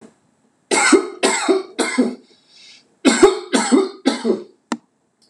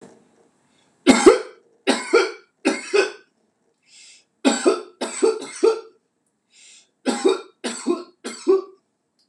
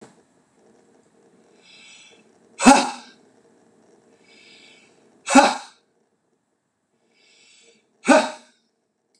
{"cough_length": "5.3 s", "cough_amplitude": 26028, "cough_signal_mean_std_ratio": 0.5, "three_cough_length": "9.3 s", "three_cough_amplitude": 26028, "three_cough_signal_mean_std_ratio": 0.39, "exhalation_length": "9.2 s", "exhalation_amplitude": 26028, "exhalation_signal_mean_std_ratio": 0.22, "survey_phase": "beta (2021-08-13 to 2022-03-07)", "age": "45-64", "gender": "Male", "wearing_mask": "No", "symptom_none": true, "smoker_status": "Ex-smoker", "respiratory_condition_asthma": false, "respiratory_condition_other": false, "recruitment_source": "REACT", "submission_delay": "3 days", "covid_test_result": "Negative", "covid_test_method": "RT-qPCR", "influenza_a_test_result": "Negative", "influenza_b_test_result": "Negative"}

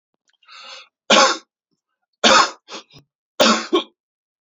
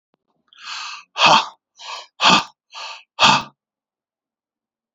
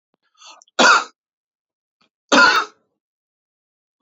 {"three_cough_length": "4.5 s", "three_cough_amplitude": 30296, "three_cough_signal_mean_std_ratio": 0.35, "exhalation_length": "4.9 s", "exhalation_amplitude": 30645, "exhalation_signal_mean_std_ratio": 0.34, "cough_length": "4.0 s", "cough_amplitude": 30666, "cough_signal_mean_std_ratio": 0.31, "survey_phase": "beta (2021-08-13 to 2022-03-07)", "age": "45-64", "gender": "Male", "wearing_mask": "No", "symptom_none": true, "smoker_status": "Ex-smoker", "respiratory_condition_asthma": false, "respiratory_condition_other": false, "recruitment_source": "REACT", "submission_delay": "2 days", "covid_test_result": "Negative", "covid_test_method": "RT-qPCR"}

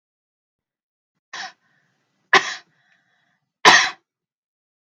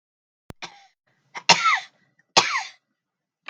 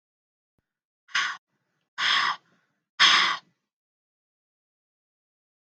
{"three_cough_length": "4.9 s", "three_cough_amplitude": 30818, "three_cough_signal_mean_std_ratio": 0.22, "cough_length": "3.5 s", "cough_amplitude": 31242, "cough_signal_mean_std_ratio": 0.29, "exhalation_length": "5.6 s", "exhalation_amplitude": 16768, "exhalation_signal_mean_std_ratio": 0.3, "survey_phase": "beta (2021-08-13 to 2022-03-07)", "age": "45-64", "gender": "Female", "wearing_mask": "No", "symptom_fatigue": true, "symptom_onset": "12 days", "smoker_status": "Never smoked", "respiratory_condition_asthma": false, "respiratory_condition_other": false, "recruitment_source": "REACT", "submission_delay": "4 days", "covid_test_result": "Negative", "covid_test_method": "RT-qPCR"}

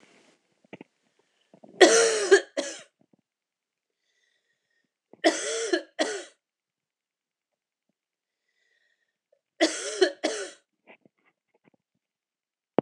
{"three_cough_length": "12.8 s", "three_cough_amplitude": 25560, "three_cough_signal_mean_std_ratio": 0.26, "survey_phase": "alpha (2021-03-01 to 2021-08-12)", "age": "45-64", "gender": "Female", "wearing_mask": "No", "symptom_cough_any": true, "symptom_fatigue": true, "symptom_headache": true, "symptom_onset": "4 days", "smoker_status": "Ex-smoker", "respiratory_condition_asthma": false, "respiratory_condition_other": false, "recruitment_source": "Test and Trace", "submission_delay": "2 days", "covid_test_result": "Positive", "covid_test_method": "RT-qPCR", "covid_ct_value": 23.2, "covid_ct_gene": "ORF1ab gene"}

